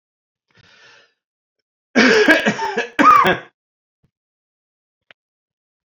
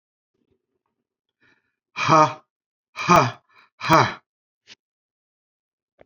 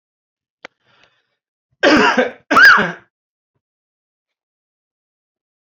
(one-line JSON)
{"three_cough_length": "5.9 s", "three_cough_amplitude": 28302, "three_cough_signal_mean_std_ratio": 0.35, "exhalation_length": "6.1 s", "exhalation_amplitude": 28146, "exhalation_signal_mean_std_ratio": 0.27, "cough_length": "5.7 s", "cough_amplitude": 31209, "cough_signal_mean_std_ratio": 0.31, "survey_phase": "beta (2021-08-13 to 2022-03-07)", "age": "65+", "gender": "Male", "wearing_mask": "No", "symptom_cough_any": true, "symptom_runny_or_blocked_nose": true, "symptom_sore_throat": true, "smoker_status": "Ex-smoker", "respiratory_condition_asthma": false, "respiratory_condition_other": false, "recruitment_source": "Test and Trace", "submission_delay": "1 day", "covid_test_result": "Negative", "covid_test_method": "RT-qPCR"}